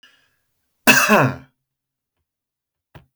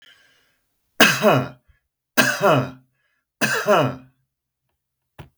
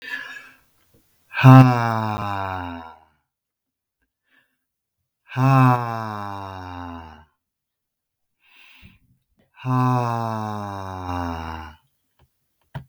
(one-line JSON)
{"cough_length": "3.2 s", "cough_amplitude": 32768, "cough_signal_mean_std_ratio": 0.29, "three_cough_length": "5.4 s", "three_cough_amplitude": 32768, "three_cough_signal_mean_std_ratio": 0.4, "exhalation_length": "12.9 s", "exhalation_amplitude": 32768, "exhalation_signal_mean_std_ratio": 0.34, "survey_phase": "beta (2021-08-13 to 2022-03-07)", "age": "45-64", "gender": "Male", "wearing_mask": "No", "symptom_none": true, "smoker_status": "Ex-smoker", "respiratory_condition_asthma": false, "respiratory_condition_other": false, "recruitment_source": "REACT", "submission_delay": "2 days", "covid_test_result": "Negative", "covid_test_method": "RT-qPCR", "influenza_a_test_result": "Negative", "influenza_b_test_result": "Negative"}